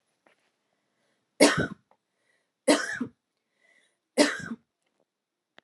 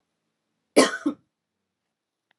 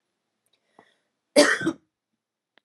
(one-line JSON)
{"three_cough_length": "5.6 s", "three_cough_amplitude": 23062, "three_cough_signal_mean_std_ratio": 0.26, "cough_length": "2.4 s", "cough_amplitude": 25009, "cough_signal_mean_std_ratio": 0.22, "exhalation_length": "2.6 s", "exhalation_amplitude": 24658, "exhalation_signal_mean_std_ratio": 0.25, "survey_phase": "beta (2021-08-13 to 2022-03-07)", "age": "18-44", "gender": "Female", "wearing_mask": "No", "symptom_cough_any": true, "symptom_runny_or_blocked_nose": true, "symptom_fatigue": true, "symptom_headache": true, "symptom_other": true, "symptom_onset": "3 days", "smoker_status": "Never smoked", "respiratory_condition_asthma": true, "respiratory_condition_other": false, "recruitment_source": "Test and Trace", "submission_delay": "2 days", "covid_test_result": "Positive", "covid_test_method": "RT-qPCR", "covid_ct_value": 18.3, "covid_ct_gene": "ORF1ab gene", "covid_ct_mean": 18.7, "covid_viral_load": "750000 copies/ml", "covid_viral_load_category": "Low viral load (10K-1M copies/ml)"}